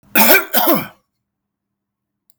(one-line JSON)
{"cough_length": "2.4 s", "cough_amplitude": 32767, "cough_signal_mean_std_ratio": 0.41, "survey_phase": "beta (2021-08-13 to 2022-03-07)", "age": "45-64", "gender": "Male", "wearing_mask": "No", "symptom_none": true, "smoker_status": "Never smoked", "respiratory_condition_asthma": false, "respiratory_condition_other": false, "recruitment_source": "Test and Trace", "submission_delay": "0 days", "covid_test_result": "Negative", "covid_test_method": "LFT"}